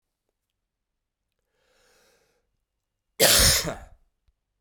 {"cough_length": "4.6 s", "cough_amplitude": 20968, "cough_signal_mean_std_ratio": 0.26, "survey_phase": "beta (2021-08-13 to 2022-03-07)", "age": "18-44", "gender": "Male", "wearing_mask": "No", "symptom_cough_any": true, "symptom_new_continuous_cough": true, "symptom_runny_or_blocked_nose": true, "symptom_fatigue": true, "symptom_headache": true, "symptom_change_to_sense_of_smell_or_taste": true, "symptom_loss_of_taste": true, "symptom_onset": "4 days", "smoker_status": "Never smoked", "respiratory_condition_asthma": false, "respiratory_condition_other": false, "recruitment_source": "Test and Trace", "submission_delay": "1 day", "covid_test_result": "Positive", "covid_test_method": "RT-qPCR", "covid_ct_value": 16.7, "covid_ct_gene": "ORF1ab gene", "covid_ct_mean": 17.4, "covid_viral_load": "2000000 copies/ml", "covid_viral_load_category": "High viral load (>1M copies/ml)"}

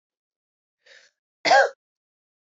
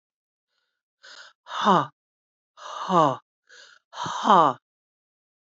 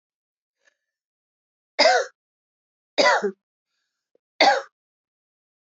{"cough_length": "2.5 s", "cough_amplitude": 18705, "cough_signal_mean_std_ratio": 0.25, "exhalation_length": "5.5 s", "exhalation_amplitude": 23142, "exhalation_signal_mean_std_ratio": 0.32, "three_cough_length": "5.6 s", "three_cough_amplitude": 24716, "three_cough_signal_mean_std_ratio": 0.29, "survey_phase": "beta (2021-08-13 to 2022-03-07)", "age": "45-64", "gender": "Female", "wearing_mask": "No", "symptom_runny_or_blocked_nose": true, "symptom_fatigue": true, "symptom_headache": true, "symptom_onset": "2 days", "smoker_status": "Never smoked", "respiratory_condition_asthma": true, "respiratory_condition_other": false, "recruitment_source": "Test and Trace", "submission_delay": "1 day", "covid_test_result": "Positive", "covid_test_method": "RT-qPCR", "covid_ct_value": 18.2, "covid_ct_gene": "ORF1ab gene", "covid_ct_mean": 18.6, "covid_viral_load": "770000 copies/ml", "covid_viral_load_category": "Low viral load (10K-1M copies/ml)"}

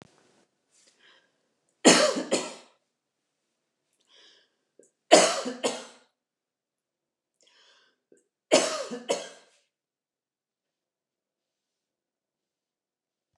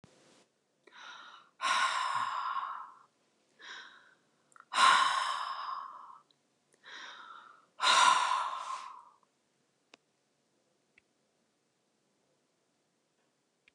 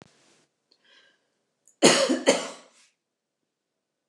{"three_cough_length": "13.4 s", "three_cough_amplitude": 27098, "three_cough_signal_mean_std_ratio": 0.23, "exhalation_length": "13.7 s", "exhalation_amplitude": 8423, "exhalation_signal_mean_std_ratio": 0.38, "cough_length": "4.1 s", "cough_amplitude": 28927, "cough_signal_mean_std_ratio": 0.27, "survey_phase": "beta (2021-08-13 to 2022-03-07)", "age": "65+", "gender": "Female", "wearing_mask": "No", "symptom_none": true, "smoker_status": "Never smoked", "respiratory_condition_asthma": false, "respiratory_condition_other": false, "recruitment_source": "REACT", "submission_delay": "2 days", "covid_test_result": "Negative", "covid_test_method": "RT-qPCR", "influenza_a_test_result": "Negative", "influenza_b_test_result": "Negative"}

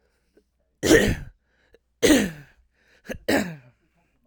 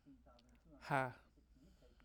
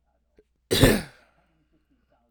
{"three_cough_length": "4.3 s", "three_cough_amplitude": 26958, "three_cough_signal_mean_std_ratio": 0.35, "exhalation_length": "2.0 s", "exhalation_amplitude": 2348, "exhalation_signal_mean_std_ratio": 0.32, "cough_length": "2.3 s", "cough_amplitude": 24828, "cough_signal_mean_std_ratio": 0.27, "survey_phase": "alpha (2021-03-01 to 2021-08-12)", "age": "18-44", "gender": "Male", "wearing_mask": "No", "symptom_none": true, "symptom_prefer_not_to_say": true, "smoker_status": "Never smoked", "respiratory_condition_asthma": false, "respiratory_condition_other": false, "recruitment_source": "REACT", "submission_delay": "1 day", "covid_test_result": "Negative", "covid_test_method": "RT-qPCR"}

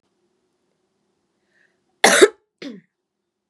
{"cough_length": "3.5 s", "cough_amplitude": 32767, "cough_signal_mean_std_ratio": 0.21, "survey_phase": "beta (2021-08-13 to 2022-03-07)", "age": "18-44", "gender": "Female", "wearing_mask": "No", "symptom_cough_any": true, "symptom_onset": "4 days", "smoker_status": "Never smoked", "respiratory_condition_asthma": false, "respiratory_condition_other": false, "recruitment_source": "REACT", "submission_delay": "1 day", "covid_test_result": "Negative", "covid_test_method": "RT-qPCR", "influenza_a_test_result": "Negative", "influenza_b_test_result": "Negative"}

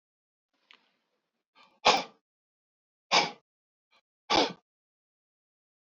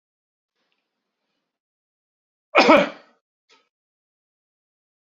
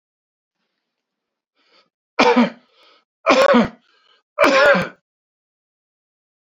{"exhalation_length": "6.0 s", "exhalation_amplitude": 17306, "exhalation_signal_mean_std_ratio": 0.22, "cough_length": "5.0 s", "cough_amplitude": 32768, "cough_signal_mean_std_ratio": 0.19, "three_cough_length": "6.6 s", "three_cough_amplitude": 30164, "three_cough_signal_mean_std_ratio": 0.35, "survey_phase": "beta (2021-08-13 to 2022-03-07)", "age": "65+", "gender": "Male", "wearing_mask": "No", "symptom_cough_any": true, "symptom_runny_or_blocked_nose": true, "symptom_sore_throat": true, "symptom_other": true, "smoker_status": "Never smoked", "respiratory_condition_asthma": false, "respiratory_condition_other": false, "recruitment_source": "Test and Trace", "submission_delay": "2 days", "covid_test_result": "Positive", "covid_test_method": "RT-qPCR", "covid_ct_value": 20.1, "covid_ct_gene": "ORF1ab gene"}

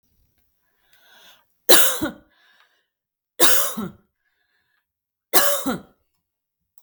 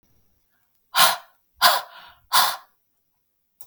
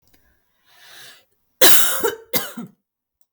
{"three_cough_length": "6.8 s", "three_cough_amplitude": 32768, "three_cough_signal_mean_std_ratio": 0.3, "exhalation_length": "3.7 s", "exhalation_amplitude": 32185, "exhalation_signal_mean_std_ratio": 0.32, "cough_length": "3.3 s", "cough_amplitude": 32768, "cough_signal_mean_std_ratio": 0.33, "survey_phase": "beta (2021-08-13 to 2022-03-07)", "age": "45-64", "gender": "Female", "wearing_mask": "No", "symptom_none": true, "smoker_status": "Ex-smoker", "respiratory_condition_asthma": false, "respiratory_condition_other": false, "recruitment_source": "REACT", "submission_delay": "1 day", "covid_test_result": "Negative", "covid_test_method": "RT-qPCR", "influenza_a_test_result": "Negative", "influenza_b_test_result": "Negative"}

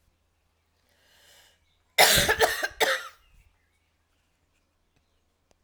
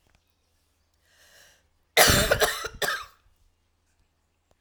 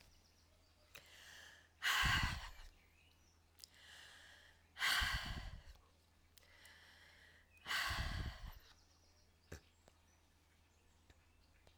{"three_cough_length": "5.6 s", "three_cough_amplitude": 19976, "three_cough_signal_mean_std_ratio": 0.29, "cough_length": "4.6 s", "cough_amplitude": 25561, "cough_signal_mean_std_ratio": 0.31, "exhalation_length": "11.8 s", "exhalation_amplitude": 2067, "exhalation_signal_mean_std_ratio": 0.4, "survey_phase": "alpha (2021-03-01 to 2021-08-12)", "age": "45-64", "gender": "Female", "wearing_mask": "No", "symptom_cough_any": true, "symptom_fatigue": true, "symptom_change_to_sense_of_smell_or_taste": true, "symptom_loss_of_taste": true, "smoker_status": "Never smoked", "respiratory_condition_asthma": false, "respiratory_condition_other": false, "recruitment_source": "Test and Trace", "submission_delay": "1 day", "covid_test_result": "Positive", "covid_test_method": "RT-qPCR", "covid_ct_value": 18.7, "covid_ct_gene": "N gene", "covid_ct_mean": 18.8, "covid_viral_load": "700000 copies/ml", "covid_viral_load_category": "Low viral load (10K-1M copies/ml)"}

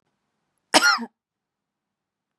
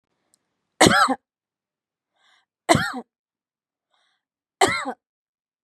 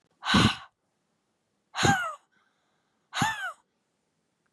{"cough_length": "2.4 s", "cough_amplitude": 32728, "cough_signal_mean_std_ratio": 0.25, "three_cough_length": "5.6 s", "three_cough_amplitude": 32542, "three_cough_signal_mean_std_ratio": 0.27, "exhalation_length": "4.5 s", "exhalation_amplitude": 12418, "exhalation_signal_mean_std_ratio": 0.35, "survey_phase": "beta (2021-08-13 to 2022-03-07)", "age": "18-44", "gender": "Female", "wearing_mask": "No", "symptom_cough_any": true, "smoker_status": "Never smoked", "respiratory_condition_asthma": false, "respiratory_condition_other": false, "recruitment_source": "REACT", "submission_delay": "2 days", "covid_test_result": "Negative", "covid_test_method": "RT-qPCR"}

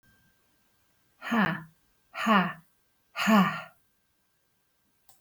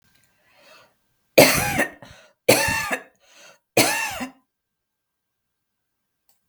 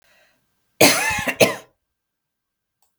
{"exhalation_length": "5.2 s", "exhalation_amplitude": 9620, "exhalation_signal_mean_std_ratio": 0.36, "three_cough_length": "6.5 s", "three_cough_amplitude": 32768, "three_cough_signal_mean_std_ratio": 0.32, "cough_length": "3.0 s", "cough_amplitude": 32767, "cough_signal_mean_std_ratio": 0.32, "survey_phase": "beta (2021-08-13 to 2022-03-07)", "age": "45-64", "gender": "Female", "wearing_mask": "No", "symptom_none": true, "smoker_status": "Never smoked", "respiratory_condition_asthma": false, "respiratory_condition_other": false, "recruitment_source": "REACT", "submission_delay": "2 days", "covid_test_result": "Negative", "covid_test_method": "RT-qPCR", "influenza_a_test_result": "Negative", "influenza_b_test_result": "Negative"}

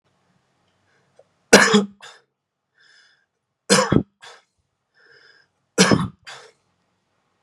{"three_cough_length": "7.4 s", "three_cough_amplitude": 32768, "three_cough_signal_mean_std_ratio": 0.26, "survey_phase": "beta (2021-08-13 to 2022-03-07)", "age": "18-44", "gender": "Male", "wearing_mask": "No", "symptom_headache": true, "smoker_status": "Never smoked", "respiratory_condition_asthma": false, "respiratory_condition_other": false, "recruitment_source": "REACT", "submission_delay": "1 day", "covid_test_result": "Negative", "covid_test_method": "RT-qPCR", "influenza_a_test_result": "Negative", "influenza_b_test_result": "Negative"}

